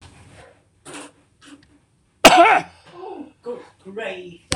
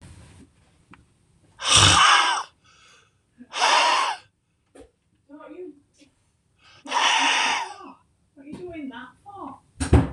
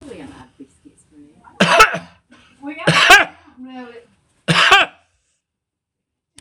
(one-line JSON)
{"cough_length": "4.6 s", "cough_amplitude": 26028, "cough_signal_mean_std_ratio": 0.3, "exhalation_length": "10.1 s", "exhalation_amplitude": 25625, "exhalation_signal_mean_std_ratio": 0.42, "three_cough_length": "6.4 s", "three_cough_amplitude": 26028, "three_cough_signal_mean_std_ratio": 0.36, "survey_phase": "beta (2021-08-13 to 2022-03-07)", "age": "65+", "gender": "Male", "wearing_mask": "No", "symptom_none": true, "smoker_status": "Never smoked", "respiratory_condition_asthma": false, "respiratory_condition_other": false, "recruitment_source": "REACT", "submission_delay": "2 days", "covid_test_result": "Negative", "covid_test_method": "RT-qPCR", "influenza_a_test_result": "Negative", "influenza_b_test_result": "Negative"}